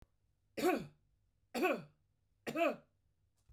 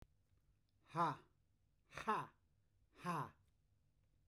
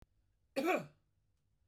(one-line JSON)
{"three_cough_length": "3.5 s", "three_cough_amplitude": 2819, "three_cough_signal_mean_std_ratio": 0.38, "exhalation_length": "4.3 s", "exhalation_amplitude": 1376, "exhalation_signal_mean_std_ratio": 0.35, "cough_length": "1.7 s", "cough_amplitude": 2384, "cough_signal_mean_std_ratio": 0.33, "survey_phase": "beta (2021-08-13 to 2022-03-07)", "age": "45-64", "gender": "Male", "wearing_mask": "No", "symptom_none": true, "smoker_status": "Ex-smoker", "respiratory_condition_asthma": false, "respiratory_condition_other": false, "recruitment_source": "REACT", "submission_delay": "1 day", "covid_test_result": "Negative", "covid_test_method": "RT-qPCR", "influenza_a_test_result": "Negative", "influenza_b_test_result": "Negative"}